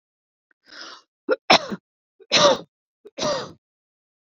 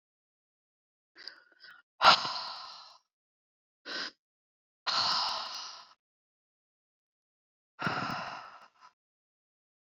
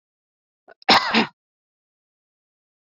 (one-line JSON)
{"three_cough_length": "4.3 s", "three_cough_amplitude": 29912, "three_cough_signal_mean_std_ratio": 0.31, "exhalation_length": "9.8 s", "exhalation_amplitude": 19271, "exhalation_signal_mean_std_ratio": 0.29, "cough_length": "2.9 s", "cough_amplitude": 27811, "cough_signal_mean_std_ratio": 0.25, "survey_phase": "beta (2021-08-13 to 2022-03-07)", "age": "45-64", "gender": "Female", "wearing_mask": "No", "symptom_headache": true, "symptom_onset": "12 days", "smoker_status": "Ex-smoker", "respiratory_condition_asthma": false, "respiratory_condition_other": false, "recruitment_source": "REACT", "submission_delay": "0 days", "covid_test_result": "Negative", "covid_test_method": "RT-qPCR"}